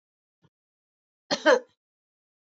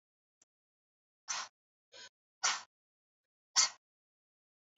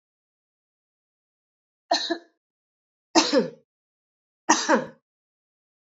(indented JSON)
{
  "cough_length": "2.6 s",
  "cough_amplitude": 13195,
  "cough_signal_mean_std_ratio": 0.22,
  "exhalation_length": "4.8 s",
  "exhalation_amplitude": 6663,
  "exhalation_signal_mean_std_ratio": 0.21,
  "three_cough_length": "5.8 s",
  "three_cough_amplitude": 22769,
  "three_cough_signal_mean_std_ratio": 0.28,
  "survey_phase": "beta (2021-08-13 to 2022-03-07)",
  "age": "65+",
  "gender": "Female",
  "wearing_mask": "No",
  "symptom_none": true,
  "smoker_status": "Never smoked",
  "respiratory_condition_asthma": false,
  "respiratory_condition_other": false,
  "recruitment_source": "REACT",
  "submission_delay": "6 days",
  "covid_test_result": "Positive",
  "covid_test_method": "RT-qPCR",
  "covid_ct_value": 36.5,
  "covid_ct_gene": "N gene",
  "influenza_a_test_result": "Negative",
  "influenza_b_test_result": "Negative"
}